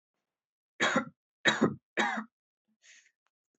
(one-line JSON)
{"three_cough_length": "3.6 s", "three_cough_amplitude": 11573, "three_cough_signal_mean_std_ratio": 0.35, "survey_phase": "beta (2021-08-13 to 2022-03-07)", "age": "18-44", "gender": "Male", "wearing_mask": "No", "symptom_cough_any": true, "symptom_sore_throat": true, "smoker_status": "Never smoked", "respiratory_condition_asthma": false, "respiratory_condition_other": false, "recruitment_source": "Test and Trace", "submission_delay": "2 days", "covid_test_result": "Positive", "covid_test_method": "RT-qPCR", "covid_ct_value": 14.8, "covid_ct_gene": "ORF1ab gene"}